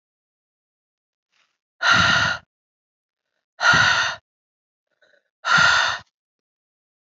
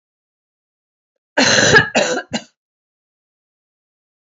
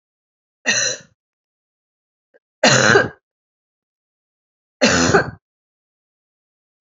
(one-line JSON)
{"exhalation_length": "7.2 s", "exhalation_amplitude": 21186, "exhalation_signal_mean_std_ratio": 0.38, "cough_length": "4.3 s", "cough_amplitude": 32767, "cough_signal_mean_std_ratio": 0.34, "three_cough_length": "6.8 s", "three_cough_amplitude": 29594, "three_cough_signal_mean_std_ratio": 0.32, "survey_phase": "beta (2021-08-13 to 2022-03-07)", "age": "45-64", "gender": "Female", "wearing_mask": "No", "symptom_cough_any": true, "symptom_runny_or_blocked_nose": true, "symptom_shortness_of_breath": true, "symptom_abdominal_pain": true, "symptom_fatigue": true, "symptom_headache": true, "symptom_change_to_sense_of_smell_or_taste": true, "symptom_loss_of_taste": true, "smoker_status": "Never smoked", "respiratory_condition_asthma": false, "respiratory_condition_other": false, "recruitment_source": "Test and Trace", "submission_delay": "2 days", "covid_test_result": "Positive", "covid_test_method": "RT-qPCR"}